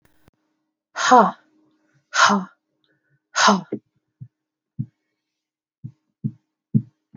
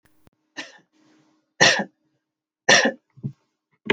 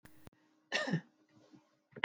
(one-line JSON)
{"exhalation_length": "7.2 s", "exhalation_amplitude": 27258, "exhalation_signal_mean_std_ratio": 0.29, "three_cough_length": "3.9 s", "three_cough_amplitude": 27570, "three_cough_signal_mean_std_ratio": 0.29, "cough_length": "2.0 s", "cough_amplitude": 7357, "cough_signal_mean_std_ratio": 0.3, "survey_phase": "beta (2021-08-13 to 2022-03-07)", "age": "45-64", "gender": "Female", "wearing_mask": "No", "symptom_none": true, "symptom_onset": "12 days", "smoker_status": "Ex-smoker", "respiratory_condition_asthma": false, "respiratory_condition_other": false, "recruitment_source": "REACT", "submission_delay": "2 days", "covid_test_result": "Negative", "covid_test_method": "RT-qPCR"}